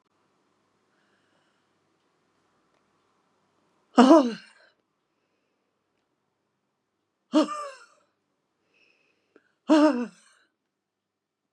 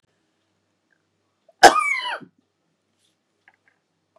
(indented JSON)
{
  "exhalation_length": "11.5 s",
  "exhalation_amplitude": 28494,
  "exhalation_signal_mean_std_ratio": 0.21,
  "cough_length": "4.2 s",
  "cough_amplitude": 32768,
  "cough_signal_mean_std_ratio": 0.2,
  "survey_phase": "beta (2021-08-13 to 2022-03-07)",
  "age": "65+",
  "gender": "Female",
  "wearing_mask": "No",
  "symptom_none": true,
  "smoker_status": "Ex-smoker",
  "respiratory_condition_asthma": false,
  "respiratory_condition_other": true,
  "recruitment_source": "REACT",
  "submission_delay": "1 day",
  "covid_test_result": "Negative",
  "covid_test_method": "RT-qPCR",
  "influenza_a_test_result": "Negative",
  "influenza_b_test_result": "Negative"
}